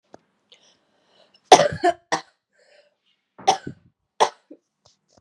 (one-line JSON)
{"three_cough_length": "5.2 s", "three_cough_amplitude": 32768, "three_cough_signal_mean_std_ratio": 0.22, "survey_phase": "beta (2021-08-13 to 2022-03-07)", "age": "18-44", "gender": "Female", "wearing_mask": "No", "symptom_cough_any": true, "symptom_runny_or_blocked_nose": true, "symptom_fatigue": true, "symptom_headache": true, "symptom_onset": "3 days", "smoker_status": "Never smoked", "recruitment_source": "Test and Trace", "submission_delay": "2 days", "covid_test_result": "Positive", "covid_test_method": "RT-qPCR", "covid_ct_value": 30.1, "covid_ct_gene": "ORF1ab gene"}